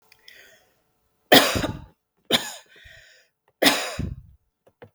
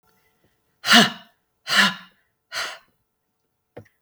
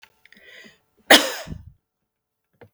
three_cough_length: 4.9 s
three_cough_amplitude: 32768
three_cough_signal_mean_std_ratio: 0.3
exhalation_length: 4.0 s
exhalation_amplitude: 32766
exhalation_signal_mean_std_ratio: 0.29
cough_length: 2.7 s
cough_amplitude: 32768
cough_signal_mean_std_ratio: 0.21
survey_phase: beta (2021-08-13 to 2022-03-07)
age: 45-64
gender: Female
wearing_mask: 'No'
symptom_none: true
smoker_status: Never smoked
respiratory_condition_asthma: false
respiratory_condition_other: false
recruitment_source: REACT
submission_delay: 1 day
covid_test_result: Negative
covid_test_method: RT-qPCR
influenza_a_test_result: Negative
influenza_b_test_result: Negative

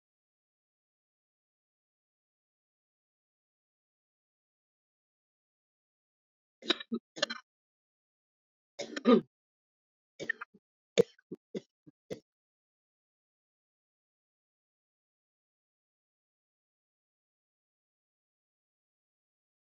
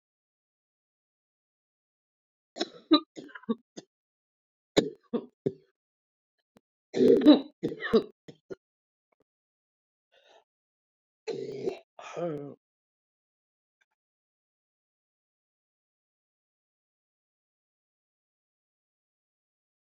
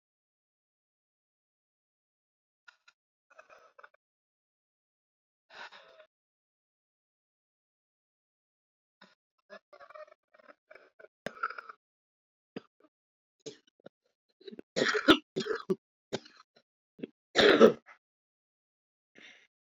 cough_length: 19.8 s
cough_amplitude: 10722
cough_signal_mean_std_ratio: 0.12
three_cough_length: 19.9 s
three_cough_amplitude: 16324
three_cough_signal_mean_std_ratio: 0.2
exhalation_length: 19.7 s
exhalation_amplitude: 16134
exhalation_signal_mean_std_ratio: 0.17
survey_phase: beta (2021-08-13 to 2022-03-07)
age: 45-64
gender: Female
wearing_mask: 'No'
symptom_cough_any: true
symptom_runny_or_blocked_nose: true
symptom_shortness_of_breath: true
symptom_sore_throat: true
symptom_abdominal_pain: true
symptom_diarrhoea: true
symptom_fatigue: true
symptom_fever_high_temperature: true
symptom_headache: true
symptom_change_to_sense_of_smell_or_taste: true
symptom_loss_of_taste: true
symptom_other: true
smoker_status: Ex-smoker
respiratory_condition_asthma: false
respiratory_condition_other: false
recruitment_source: Test and Trace
submission_delay: 2 days
covid_test_result: Positive
covid_test_method: LFT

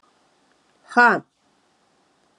exhalation_length: 2.4 s
exhalation_amplitude: 20445
exhalation_signal_mean_std_ratio: 0.25
survey_phase: alpha (2021-03-01 to 2021-08-12)
age: 18-44
gender: Female
wearing_mask: 'No'
symptom_cough_any: true
symptom_diarrhoea: true
symptom_headache: true
symptom_change_to_sense_of_smell_or_taste: true
smoker_status: Never smoked
respiratory_condition_asthma: false
respiratory_condition_other: false
recruitment_source: Test and Trace
submission_delay: 2 days
covid_test_result: Positive
covid_test_method: RT-qPCR
covid_ct_value: 19.4
covid_ct_gene: ORF1ab gene
covid_ct_mean: 20.4
covid_viral_load: 200000 copies/ml
covid_viral_load_category: Low viral load (10K-1M copies/ml)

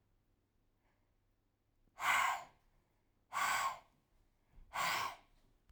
exhalation_length: 5.7 s
exhalation_amplitude: 3204
exhalation_signal_mean_std_ratio: 0.39
survey_phase: alpha (2021-03-01 to 2021-08-12)
age: 18-44
gender: Female
wearing_mask: 'No'
symptom_none: true
smoker_status: Never smoked
respiratory_condition_asthma: false
respiratory_condition_other: false
recruitment_source: REACT
submission_delay: 1 day
covid_test_result: Negative
covid_test_method: RT-qPCR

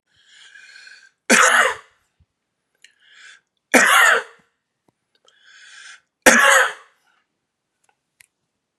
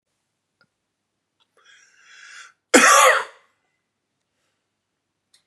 three_cough_length: 8.8 s
three_cough_amplitude: 32768
three_cough_signal_mean_std_ratio: 0.33
cough_length: 5.5 s
cough_amplitude: 32767
cough_signal_mean_std_ratio: 0.24
survey_phase: beta (2021-08-13 to 2022-03-07)
age: 18-44
gender: Male
wearing_mask: 'No'
symptom_sore_throat: true
symptom_onset: 10 days
smoker_status: Ex-smoker
respiratory_condition_asthma: false
respiratory_condition_other: false
recruitment_source: REACT
submission_delay: 0 days
covid_test_result: Negative
covid_test_method: RT-qPCR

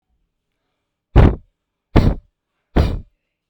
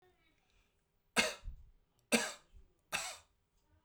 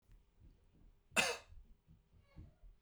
exhalation_length: 3.5 s
exhalation_amplitude: 32768
exhalation_signal_mean_std_ratio: 0.31
three_cough_length: 3.8 s
three_cough_amplitude: 6357
three_cough_signal_mean_std_ratio: 0.3
cough_length: 2.8 s
cough_amplitude: 4778
cough_signal_mean_std_ratio: 0.28
survey_phase: beta (2021-08-13 to 2022-03-07)
age: 18-44
gender: Male
wearing_mask: 'No'
symptom_none: true
smoker_status: Ex-smoker
respiratory_condition_asthma: false
respiratory_condition_other: false
recruitment_source: Test and Trace
submission_delay: 0 days
covid_test_result: Negative
covid_test_method: LFT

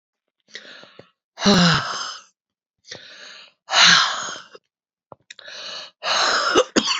exhalation_length: 7.0 s
exhalation_amplitude: 28997
exhalation_signal_mean_std_ratio: 0.45
survey_phase: alpha (2021-03-01 to 2021-08-12)
age: 45-64
gender: Female
wearing_mask: 'No'
symptom_cough_any: true
symptom_shortness_of_breath: true
symptom_fatigue: true
symptom_headache: true
smoker_status: Never smoked
respiratory_condition_asthma: true
respiratory_condition_other: false
recruitment_source: Test and Trace
submission_delay: 2 days
covid_test_result: Positive
covid_test_method: RT-qPCR
covid_ct_value: 12.3
covid_ct_gene: ORF1ab gene
covid_ct_mean: 12.8
covid_viral_load: 62000000 copies/ml
covid_viral_load_category: High viral load (>1M copies/ml)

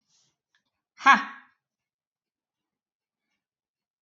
exhalation_length: 4.0 s
exhalation_amplitude: 22219
exhalation_signal_mean_std_ratio: 0.15
survey_phase: beta (2021-08-13 to 2022-03-07)
age: 45-64
gender: Female
wearing_mask: 'No'
symptom_runny_or_blocked_nose: true
symptom_abdominal_pain: true
symptom_onset: 12 days
smoker_status: Never smoked
respiratory_condition_asthma: true
respiratory_condition_other: false
recruitment_source: REACT
submission_delay: 2 days
covid_test_result: Negative
covid_test_method: RT-qPCR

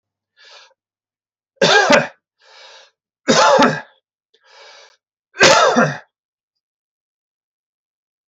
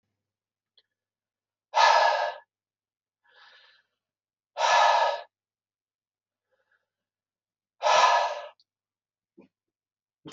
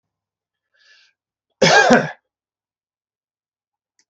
three_cough_length: 8.3 s
three_cough_amplitude: 32768
three_cough_signal_mean_std_ratio: 0.35
exhalation_length: 10.3 s
exhalation_amplitude: 15781
exhalation_signal_mean_std_ratio: 0.33
cough_length: 4.1 s
cough_amplitude: 32767
cough_signal_mean_std_ratio: 0.26
survey_phase: beta (2021-08-13 to 2022-03-07)
age: 45-64
gender: Male
wearing_mask: 'No'
symptom_none: true
smoker_status: Never smoked
respiratory_condition_asthma: false
respiratory_condition_other: false
recruitment_source: REACT
submission_delay: 3 days
covid_test_result: Negative
covid_test_method: RT-qPCR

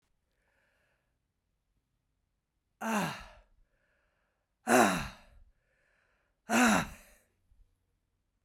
exhalation_length: 8.4 s
exhalation_amplitude: 11635
exhalation_signal_mean_std_ratio: 0.27
survey_phase: beta (2021-08-13 to 2022-03-07)
age: 45-64
gender: Female
wearing_mask: 'No'
symptom_cough_any: true
symptom_runny_or_blocked_nose: true
symptom_shortness_of_breath: true
symptom_sore_throat: true
symptom_fatigue: true
symptom_fever_high_temperature: true
symptom_headache: true
symptom_change_to_sense_of_smell_or_taste: true
symptom_other: true
symptom_onset: 6 days
smoker_status: Never smoked
respiratory_condition_asthma: false
respiratory_condition_other: false
recruitment_source: Test and Trace
submission_delay: 2 days
covid_test_result: Positive
covid_test_method: ePCR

